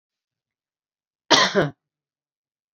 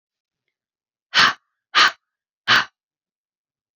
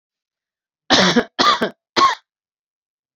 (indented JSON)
{
  "cough_length": "2.7 s",
  "cough_amplitude": 29344,
  "cough_signal_mean_std_ratio": 0.27,
  "exhalation_length": "3.8 s",
  "exhalation_amplitude": 28650,
  "exhalation_signal_mean_std_ratio": 0.28,
  "three_cough_length": "3.2 s",
  "three_cough_amplitude": 29781,
  "three_cough_signal_mean_std_ratio": 0.4,
  "survey_phase": "beta (2021-08-13 to 2022-03-07)",
  "age": "45-64",
  "gender": "Female",
  "wearing_mask": "No",
  "symptom_none": true,
  "smoker_status": "Never smoked",
  "respiratory_condition_asthma": false,
  "respiratory_condition_other": false,
  "recruitment_source": "REACT",
  "submission_delay": "1 day",
  "covid_test_result": "Negative",
  "covid_test_method": "RT-qPCR"
}